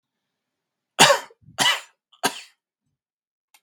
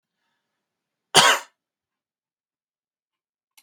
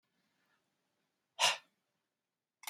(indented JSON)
{
  "three_cough_length": "3.6 s",
  "three_cough_amplitude": 32767,
  "three_cough_signal_mean_std_ratio": 0.26,
  "cough_length": "3.6 s",
  "cough_amplitude": 32768,
  "cough_signal_mean_std_ratio": 0.19,
  "exhalation_length": "2.7 s",
  "exhalation_amplitude": 5294,
  "exhalation_signal_mean_std_ratio": 0.2,
  "survey_phase": "beta (2021-08-13 to 2022-03-07)",
  "age": "45-64",
  "gender": "Male",
  "wearing_mask": "No",
  "symptom_none": true,
  "smoker_status": "Ex-smoker",
  "respiratory_condition_asthma": false,
  "respiratory_condition_other": false,
  "recruitment_source": "REACT",
  "submission_delay": "2 days",
  "covid_test_result": "Negative",
  "covid_test_method": "RT-qPCR",
  "influenza_a_test_result": "Negative",
  "influenza_b_test_result": "Negative"
}